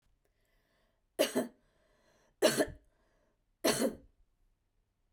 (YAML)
three_cough_length: 5.1 s
three_cough_amplitude: 7012
three_cough_signal_mean_std_ratio: 0.3
survey_phase: beta (2021-08-13 to 2022-03-07)
age: 18-44
gender: Female
wearing_mask: 'No'
symptom_none: true
smoker_status: Never smoked
respiratory_condition_asthma: false
respiratory_condition_other: false
recruitment_source: REACT
submission_delay: 2 days
covid_test_result: Negative
covid_test_method: RT-qPCR